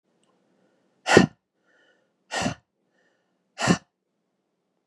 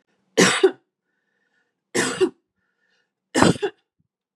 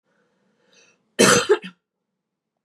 {
  "exhalation_length": "4.9 s",
  "exhalation_amplitude": 32715,
  "exhalation_signal_mean_std_ratio": 0.22,
  "three_cough_length": "4.4 s",
  "three_cough_amplitude": 32767,
  "three_cough_signal_mean_std_ratio": 0.33,
  "cough_length": "2.6 s",
  "cough_amplitude": 29193,
  "cough_signal_mean_std_ratio": 0.29,
  "survey_phase": "beta (2021-08-13 to 2022-03-07)",
  "age": "18-44",
  "gender": "Female",
  "wearing_mask": "No",
  "symptom_none": true,
  "smoker_status": "Ex-smoker",
  "respiratory_condition_asthma": true,
  "respiratory_condition_other": false,
  "recruitment_source": "REACT",
  "submission_delay": "2 days",
  "covid_test_result": "Negative",
  "covid_test_method": "RT-qPCR",
  "influenza_a_test_result": "Negative",
  "influenza_b_test_result": "Negative"
}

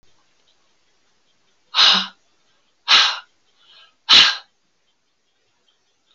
{
  "exhalation_length": "6.1 s",
  "exhalation_amplitude": 32767,
  "exhalation_signal_mean_std_ratio": 0.28,
  "survey_phase": "alpha (2021-03-01 to 2021-08-12)",
  "age": "65+",
  "gender": "Female",
  "wearing_mask": "No",
  "symptom_none": true,
  "smoker_status": "Never smoked",
  "respiratory_condition_asthma": false,
  "respiratory_condition_other": false,
  "recruitment_source": "REACT",
  "submission_delay": "14 days",
  "covid_test_result": "Negative",
  "covid_test_method": "RT-qPCR"
}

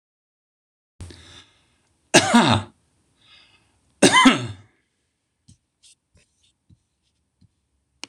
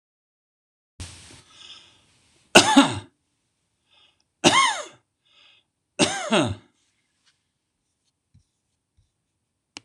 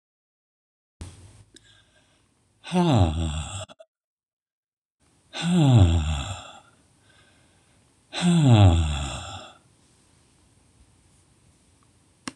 {
  "cough_length": "8.1 s",
  "cough_amplitude": 26028,
  "cough_signal_mean_std_ratio": 0.25,
  "three_cough_length": "9.8 s",
  "three_cough_amplitude": 26028,
  "three_cough_signal_mean_std_ratio": 0.25,
  "exhalation_length": "12.4 s",
  "exhalation_amplitude": 22322,
  "exhalation_signal_mean_std_ratio": 0.38,
  "survey_phase": "beta (2021-08-13 to 2022-03-07)",
  "age": "65+",
  "gender": "Male",
  "wearing_mask": "No",
  "symptom_none": true,
  "smoker_status": "Never smoked",
  "respiratory_condition_asthma": false,
  "respiratory_condition_other": false,
  "recruitment_source": "REACT",
  "submission_delay": "1 day",
  "covid_test_result": "Negative",
  "covid_test_method": "RT-qPCR"
}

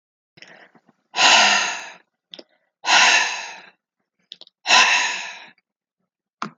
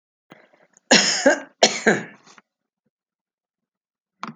{
  "exhalation_length": "6.6 s",
  "exhalation_amplitude": 31903,
  "exhalation_signal_mean_std_ratio": 0.42,
  "cough_length": "4.4 s",
  "cough_amplitude": 31682,
  "cough_signal_mean_std_ratio": 0.31,
  "survey_phase": "alpha (2021-03-01 to 2021-08-12)",
  "age": "65+",
  "gender": "Female",
  "wearing_mask": "No",
  "symptom_none": true,
  "smoker_status": "Ex-smoker",
  "respiratory_condition_asthma": false,
  "respiratory_condition_other": false,
  "recruitment_source": "REACT",
  "submission_delay": "2 days",
  "covid_test_result": "Negative",
  "covid_test_method": "RT-qPCR"
}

